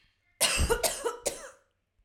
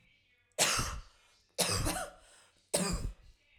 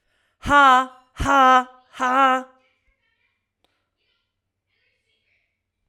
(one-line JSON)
{"cough_length": "2.0 s", "cough_amplitude": 10182, "cough_signal_mean_std_ratio": 0.51, "three_cough_length": "3.6 s", "three_cough_amplitude": 7617, "three_cough_signal_mean_std_ratio": 0.51, "exhalation_length": "5.9 s", "exhalation_amplitude": 21607, "exhalation_signal_mean_std_ratio": 0.35, "survey_phase": "alpha (2021-03-01 to 2021-08-12)", "age": "18-44", "gender": "Female", "wearing_mask": "No", "symptom_none": true, "smoker_status": "Never smoked", "respiratory_condition_asthma": false, "respiratory_condition_other": false, "recruitment_source": "REACT", "submission_delay": "1 day", "covid_test_result": "Negative", "covid_test_method": "RT-qPCR"}